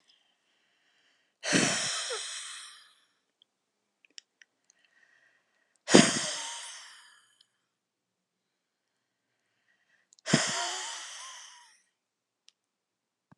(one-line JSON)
{"exhalation_length": "13.4 s", "exhalation_amplitude": 27799, "exhalation_signal_mean_std_ratio": 0.27, "survey_phase": "alpha (2021-03-01 to 2021-08-12)", "age": "65+", "gender": "Female", "wearing_mask": "No", "symptom_none": true, "smoker_status": "Never smoked", "respiratory_condition_asthma": false, "respiratory_condition_other": false, "recruitment_source": "REACT", "submission_delay": "5 days", "covid_test_result": "Negative", "covid_test_method": "RT-qPCR"}